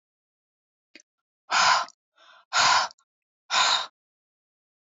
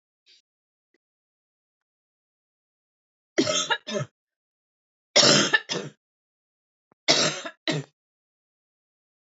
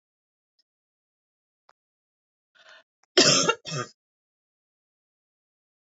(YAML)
exhalation_length: 4.9 s
exhalation_amplitude: 13521
exhalation_signal_mean_std_ratio: 0.37
three_cough_length: 9.3 s
three_cough_amplitude: 23237
three_cough_signal_mean_std_ratio: 0.29
cough_length: 6.0 s
cough_amplitude: 20424
cough_signal_mean_std_ratio: 0.21
survey_phase: beta (2021-08-13 to 2022-03-07)
age: 45-64
gender: Female
wearing_mask: 'No'
symptom_none: true
smoker_status: Never smoked
respiratory_condition_asthma: false
respiratory_condition_other: false
recruitment_source: REACT
submission_delay: 4 days
covid_test_result: Negative
covid_test_method: RT-qPCR